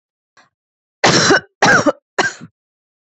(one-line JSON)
{"three_cough_length": "3.1 s", "three_cough_amplitude": 30174, "three_cough_signal_mean_std_ratio": 0.42, "survey_phase": "beta (2021-08-13 to 2022-03-07)", "age": "18-44", "gender": "Female", "wearing_mask": "No", "symptom_none": true, "smoker_status": "Never smoked", "respiratory_condition_asthma": false, "respiratory_condition_other": false, "recruitment_source": "REACT", "submission_delay": "1 day", "covid_test_result": "Negative", "covid_test_method": "RT-qPCR"}